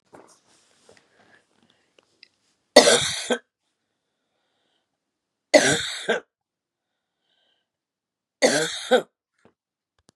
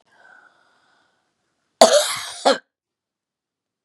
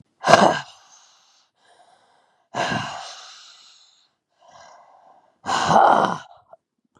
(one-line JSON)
{"three_cough_length": "10.2 s", "three_cough_amplitude": 32768, "three_cough_signal_mean_std_ratio": 0.26, "cough_length": "3.8 s", "cough_amplitude": 32768, "cough_signal_mean_std_ratio": 0.26, "exhalation_length": "7.0 s", "exhalation_amplitude": 32768, "exhalation_signal_mean_std_ratio": 0.33, "survey_phase": "beta (2021-08-13 to 2022-03-07)", "age": "65+", "gender": "Female", "wearing_mask": "No", "symptom_cough_any": true, "symptom_runny_or_blocked_nose": true, "symptom_sore_throat": true, "symptom_fatigue": true, "symptom_fever_high_temperature": true, "symptom_headache": true, "smoker_status": "Ex-smoker", "respiratory_condition_asthma": false, "respiratory_condition_other": false, "recruitment_source": "Test and Trace", "submission_delay": "2 days", "covid_test_result": "Positive", "covid_test_method": "LFT"}